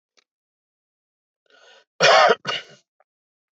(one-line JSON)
{"cough_length": "3.6 s", "cough_amplitude": 22704, "cough_signal_mean_std_ratio": 0.28, "survey_phase": "beta (2021-08-13 to 2022-03-07)", "age": "65+", "gender": "Male", "wearing_mask": "No", "symptom_cough_any": true, "symptom_runny_or_blocked_nose": true, "symptom_headache": true, "smoker_status": "Ex-smoker", "respiratory_condition_asthma": false, "respiratory_condition_other": false, "recruitment_source": "REACT", "submission_delay": "1 day", "covid_test_result": "Negative", "covid_test_method": "RT-qPCR"}